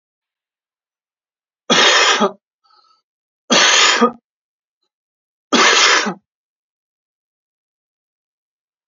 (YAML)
three_cough_length: 8.9 s
three_cough_amplitude: 32767
three_cough_signal_mean_std_ratio: 0.37
survey_phase: beta (2021-08-13 to 2022-03-07)
age: 18-44
gender: Male
wearing_mask: 'No'
symptom_none: true
smoker_status: Ex-smoker
respiratory_condition_asthma: false
respiratory_condition_other: false
recruitment_source: REACT
submission_delay: 2 days
covid_test_result: Negative
covid_test_method: RT-qPCR